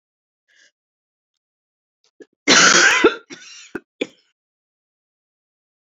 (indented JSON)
{
  "cough_length": "6.0 s",
  "cough_amplitude": 32767,
  "cough_signal_mean_std_ratio": 0.28,
  "survey_phase": "beta (2021-08-13 to 2022-03-07)",
  "age": "65+",
  "gender": "Female",
  "wearing_mask": "No",
  "symptom_new_continuous_cough": true,
  "symptom_runny_or_blocked_nose": true,
  "symptom_shortness_of_breath": true,
  "symptom_headache": true,
  "symptom_onset": "3 days",
  "smoker_status": "Never smoked",
  "respiratory_condition_asthma": false,
  "respiratory_condition_other": false,
  "recruitment_source": "Test and Trace",
  "submission_delay": "1 day",
  "covid_test_result": "Positive",
  "covid_test_method": "RT-qPCR",
  "covid_ct_value": 19.9,
  "covid_ct_gene": "ORF1ab gene",
  "covid_ct_mean": 20.4,
  "covid_viral_load": "200000 copies/ml",
  "covid_viral_load_category": "Low viral load (10K-1M copies/ml)"
}